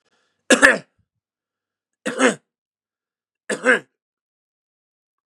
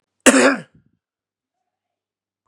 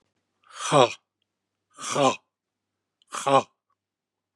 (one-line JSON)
{"three_cough_length": "5.4 s", "three_cough_amplitude": 32768, "three_cough_signal_mean_std_ratio": 0.25, "cough_length": "2.5 s", "cough_amplitude": 32768, "cough_signal_mean_std_ratio": 0.27, "exhalation_length": "4.4 s", "exhalation_amplitude": 21675, "exhalation_signal_mean_std_ratio": 0.3, "survey_phase": "beta (2021-08-13 to 2022-03-07)", "age": "65+", "gender": "Male", "wearing_mask": "No", "symptom_none": true, "smoker_status": "Never smoked", "respiratory_condition_asthma": false, "respiratory_condition_other": false, "recruitment_source": "REACT", "submission_delay": "4 days", "covid_test_result": "Negative", "covid_test_method": "RT-qPCR", "influenza_a_test_result": "Negative", "influenza_b_test_result": "Negative"}